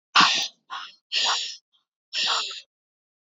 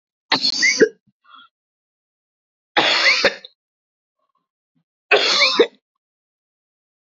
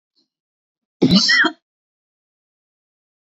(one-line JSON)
{"exhalation_length": "3.3 s", "exhalation_amplitude": 21393, "exhalation_signal_mean_std_ratio": 0.45, "three_cough_length": "7.2 s", "three_cough_amplitude": 28029, "three_cough_signal_mean_std_ratio": 0.37, "cough_length": "3.3 s", "cough_amplitude": 28424, "cough_signal_mean_std_ratio": 0.31, "survey_phase": "beta (2021-08-13 to 2022-03-07)", "age": "18-44", "gender": "Female", "wearing_mask": "No", "symptom_cough_any": true, "symptom_shortness_of_breath": true, "symptom_sore_throat": true, "symptom_fatigue": true, "symptom_headache": true, "symptom_other": true, "smoker_status": "Never smoked", "respiratory_condition_asthma": false, "respiratory_condition_other": false, "recruitment_source": "Test and Trace", "submission_delay": "2 days", "covid_test_result": "Positive", "covid_test_method": "ePCR"}